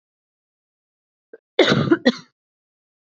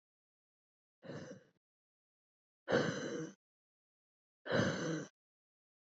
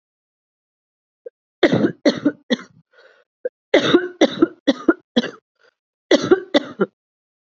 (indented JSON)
{
  "cough_length": "3.2 s",
  "cough_amplitude": 28300,
  "cough_signal_mean_std_ratio": 0.28,
  "exhalation_length": "6.0 s",
  "exhalation_amplitude": 3265,
  "exhalation_signal_mean_std_ratio": 0.36,
  "three_cough_length": "7.6 s",
  "three_cough_amplitude": 29012,
  "three_cough_signal_mean_std_ratio": 0.34,
  "survey_phase": "beta (2021-08-13 to 2022-03-07)",
  "age": "18-44",
  "gender": "Female",
  "wearing_mask": "No",
  "symptom_cough_any": true,
  "symptom_sore_throat": true,
  "symptom_fatigue": true,
  "smoker_status": "Never smoked",
  "respiratory_condition_asthma": false,
  "respiratory_condition_other": false,
  "recruitment_source": "Test and Trace",
  "submission_delay": "2 days",
  "covid_test_result": "Positive",
  "covid_test_method": "LFT"
}